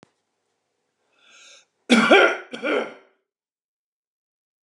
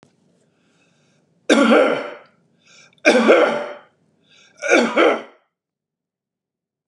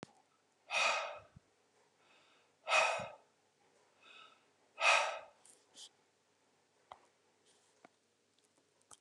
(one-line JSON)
{"cough_length": "4.6 s", "cough_amplitude": 26930, "cough_signal_mean_std_ratio": 0.3, "three_cough_length": "6.9 s", "three_cough_amplitude": 32768, "three_cough_signal_mean_std_ratio": 0.4, "exhalation_length": "9.0 s", "exhalation_amplitude": 4799, "exhalation_signal_mean_std_ratio": 0.3, "survey_phase": "beta (2021-08-13 to 2022-03-07)", "age": "65+", "gender": "Male", "wearing_mask": "No", "symptom_none": true, "smoker_status": "Ex-smoker", "respiratory_condition_asthma": false, "respiratory_condition_other": false, "recruitment_source": "REACT", "submission_delay": "2 days", "covid_test_result": "Negative", "covid_test_method": "RT-qPCR"}